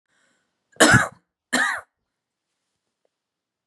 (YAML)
cough_length: 3.7 s
cough_amplitude: 29836
cough_signal_mean_std_ratio: 0.27
survey_phase: beta (2021-08-13 to 2022-03-07)
age: 18-44
gender: Female
wearing_mask: 'No'
symptom_sore_throat: true
symptom_headache: true
symptom_change_to_sense_of_smell_or_taste: true
symptom_onset: 2 days
smoker_status: Never smoked
respiratory_condition_asthma: true
respiratory_condition_other: false
recruitment_source: REACT
submission_delay: 1 day
covid_test_result: Negative
covid_test_method: RT-qPCR
influenza_a_test_result: Negative
influenza_b_test_result: Negative